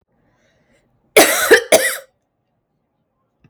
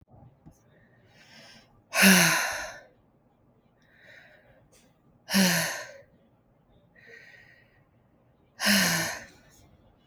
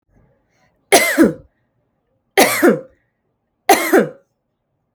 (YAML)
cough_length: 3.5 s
cough_amplitude: 32768
cough_signal_mean_std_ratio: 0.32
exhalation_length: 10.1 s
exhalation_amplitude: 22750
exhalation_signal_mean_std_ratio: 0.33
three_cough_length: 4.9 s
three_cough_amplitude: 32768
three_cough_signal_mean_std_ratio: 0.37
survey_phase: beta (2021-08-13 to 2022-03-07)
age: 45-64
gender: Female
wearing_mask: 'No'
symptom_none: true
smoker_status: Ex-smoker
respiratory_condition_asthma: false
respiratory_condition_other: false
recruitment_source: REACT
submission_delay: 2 days
covid_test_result: Negative
covid_test_method: RT-qPCR
influenza_a_test_result: Negative
influenza_b_test_result: Negative